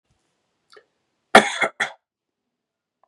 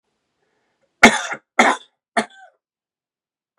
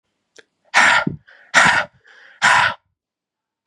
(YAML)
cough_length: 3.1 s
cough_amplitude: 32768
cough_signal_mean_std_ratio: 0.2
three_cough_length: 3.6 s
three_cough_amplitude: 32768
three_cough_signal_mean_std_ratio: 0.24
exhalation_length: 3.7 s
exhalation_amplitude: 32668
exhalation_signal_mean_std_ratio: 0.42
survey_phase: beta (2021-08-13 to 2022-03-07)
age: 18-44
gender: Male
wearing_mask: 'No'
symptom_runny_or_blocked_nose: true
symptom_change_to_sense_of_smell_or_taste: true
symptom_loss_of_taste: true
symptom_onset: 3 days
smoker_status: Ex-smoker
respiratory_condition_asthma: false
respiratory_condition_other: false
recruitment_source: Test and Trace
submission_delay: 1 day
covid_test_result: Positive
covid_test_method: RT-qPCR
covid_ct_value: 16.4
covid_ct_gene: N gene